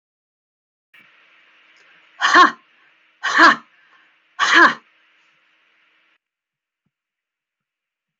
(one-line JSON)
{"exhalation_length": "8.2 s", "exhalation_amplitude": 29856, "exhalation_signal_mean_std_ratio": 0.26, "survey_phase": "alpha (2021-03-01 to 2021-08-12)", "age": "45-64", "gender": "Female", "wearing_mask": "No", "symptom_none": true, "smoker_status": "Never smoked", "respiratory_condition_asthma": false, "respiratory_condition_other": false, "recruitment_source": "REACT", "submission_delay": "1 day", "covid_test_result": "Negative", "covid_test_method": "RT-qPCR"}